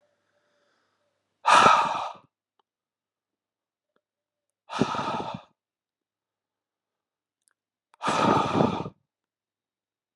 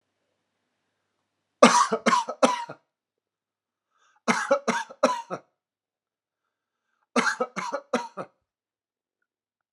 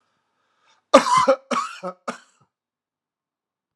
{"exhalation_length": "10.2 s", "exhalation_amplitude": 20881, "exhalation_signal_mean_std_ratio": 0.31, "three_cough_length": "9.7 s", "three_cough_amplitude": 30317, "three_cough_signal_mean_std_ratio": 0.31, "cough_length": "3.8 s", "cough_amplitude": 32768, "cough_signal_mean_std_ratio": 0.29, "survey_phase": "alpha (2021-03-01 to 2021-08-12)", "age": "45-64", "gender": "Male", "wearing_mask": "No", "symptom_none": true, "smoker_status": "Never smoked", "respiratory_condition_asthma": false, "respiratory_condition_other": false, "recruitment_source": "REACT", "submission_delay": "3 days", "covid_test_result": "Negative", "covid_test_method": "RT-qPCR"}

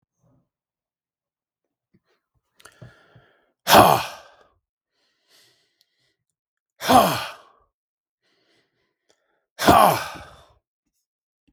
{"exhalation_length": "11.5 s", "exhalation_amplitude": 32768, "exhalation_signal_mean_std_ratio": 0.24, "survey_phase": "beta (2021-08-13 to 2022-03-07)", "age": "45-64", "gender": "Male", "wearing_mask": "No", "symptom_none": true, "smoker_status": "Ex-smoker", "respiratory_condition_asthma": false, "respiratory_condition_other": false, "recruitment_source": "REACT", "submission_delay": "1 day", "covid_test_result": "Negative", "covid_test_method": "RT-qPCR"}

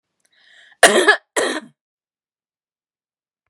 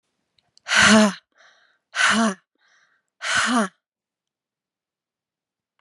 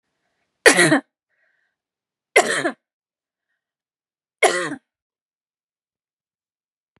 {"cough_length": "3.5 s", "cough_amplitude": 32768, "cough_signal_mean_std_ratio": 0.28, "exhalation_length": "5.8 s", "exhalation_amplitude": 28574, "exhalation_signal_mean_std_ratio": 0.36, "three_cough_length": "7.0 s", "three_cough_amplitude": 32768, "three_cough_signal_mean_std_ratio": 0.25, "survey_phase": "beta (2021-08-13 to 2022-03-07)", "age": "45-64", "gender": "Female", "wearing_mask": "No", "symptom_none": true, "smoker_status": "Never smoked", "respiratory_condition_asthma": true, "respiratory_condition_other": false, "recruitment_source": "REACT", "submission_delay": "1 day", "covid_test_result": "Negative", "covid_test_method": "RT-qPCR", "influenza_a_test_result": "Negative", "influenza_b_test_result": "Negative"}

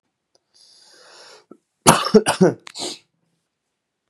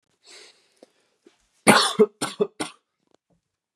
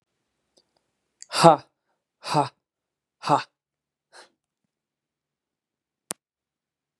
{"cough_length": "4.1 s", "cough_amplitude": 32768, "cough_signal_mean_std_ratio": 0.27, "three_cough_length": "3.8 s", "three_cough_amplitude": 32064, "three_cough_signal_mean_std_ratio": 0.27, "exhalation_length": "7.0 s", "exhalation_amplitude": 32508, "exhalation_signal_mean_std_ratio": 0.18, "survey_phase": "beta (2021-08-13 to 2022-03-07)", "age": "18-44", "gender": "Male", "wearing_mask": "No", "symptom_none": true, "smoker_status": "Never smoked", "respiratory_condition_asthma": false, "respiratory_condition_other": false, "recruitment_source": "REACT", "submission_delay": "7 days", "covid_test_result": "Negative", "covid_test_method": "RT-qPCR", "influenza_a_test_result": "Negative", "influenza_b_test_result": "Negative"}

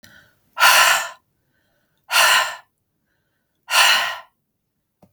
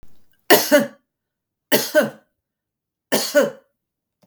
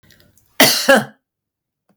{"exhalation_length": "5.1 s", "exhalation_amplitude": 32768, "exhalation_signal_mean_std_ratio": 0.41, "three_cough_length": "4.3 s", "three_cough_amplitude": 32768, "three_cough_signal_mean_std_ratio": 0.36, "cough_length": "2.0 s", "cough_amplitude": 32768, "cough_signal_mean_std_ratio": 0.35, "survey_phase": "beta (2021-08-13 to 2022-03-07)", "age": "65+", "gender": "Female", "wearing_mask": "No", "symptom_none": true, "smoker_status": "Never smoked", "respiratory_condition_asthma": false, "respiratory_condition_other": false, "recruitment_source": "REACT", "submission_delay": "1 day", "covid_test_result": "Negative", "covid_test_method": "RT-qPCR", "influenza_a_test_result": "Unknown/Void", "influenza_b_test_result": "Unknown/Void"}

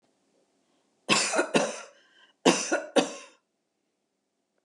{"cough_length": "4.6 s", "cough_amplitude": 23041, "cough_signal_mean_std_ratio": 0.36, "survey_phase": "alpha (2021-03-01 to 2021-08-12)", "age": "45-64", "gender": "Female", "wearing_mask": "No", "symptom_none": true, "smoker_status": "Never smoked", "respiratory_condition_asthma": false, "respiratory_condition_other": false, "recruitment_source": "REACT", "submission_delay": "5 days", "covid_test_result": "Negative", "covid_test_method": "RT-qPCR"}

